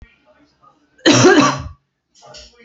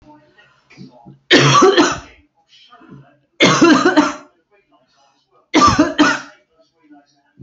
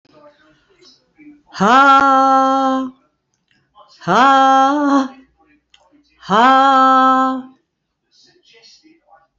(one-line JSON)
{"cough_length": "2.6 s", "cough_amplitude": 31511, "cough_signal_mean_std_ratio": 0.39, "three_cough_length": "7.4 s", "three_cough_amplitude": 31229, "three_cough_signal_mean_std_ratio": 0.43, "exhalation_length": "9.4 s", "exhalation_amplitude": 29153, "exhalation_signal_mean_std_ratio": 0.53, "survey_phase": "beta (2021-08-13 to 2022-03-07)", "age": "45-64", "gender": "Female", "wearing_mask": "No", "symptom_none": true, "symptom_onset": "8 days", "smoker_status": "Ex-smoker", "respiratory_condition_asthma": false, "respiratory_condition_other": false, "recruitment_source": "REACT", "submission_delay": "3 days", "covid_test_result": "Negative", "covid_test_method": "RT-qPCR", "influenza_a_test_result": "Negative", "influenza_b_test_result": "Negative"}